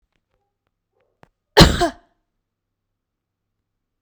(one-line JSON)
{"cough_length": "4.0 s", "cough_amplitude": 32768, "cough_signal_mean_std_ratio": 0.19, "survey_phase": "beta (2021-08-13 to 2022-03-07)", "age": "18-44", "gender": "Female", "wearing_mask": "No", "symptom_none": true, "symptom_onset": "12 days", "smoker_status": "Ex-smoker", "respiratory_condition_asthma": false, "respiratory_condition_other": false, "recruitment_source": "REACT", "submission_delay": "0 days", "covid_test_result": "Negative", "covid_test_method": "RT-qPCR"}